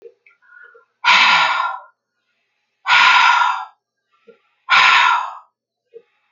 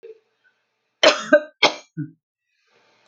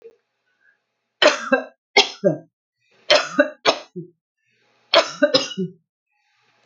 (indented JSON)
{
  "exhalation_length": "6.3 s",
  "exhalation_amplitude": 30380,
  "exhalation_signal_mean_std_ratio": 0.48,
  "cough_length": "3.1 s",
  "cough_amplitude": 29287,
  "cough_signal_mean_std_ratio": 0.27,
  "three_cough_length": "6.7 s",
  "three_cough_amplitude": 31066,
  "three_cough_signal_mean_std_ratio": 0.34,
  "survey_phase": "alpha (2021-03-01 to 2021-08-12)",
  "age": "45-64",
  "gender": "Female",
  "wearing_mask": "No",
  "symptom_none": true,
  "smoker_status": "Never smoked",
  "respiratory_condition_asthma": false,
  "respiratory_condition_other": false,
  "recruitment_source": "REACT",
  "submission_delay": "2 days",
  "covid_test_result": "Negative",
  "covid_test_method": "RT-qPCR"
}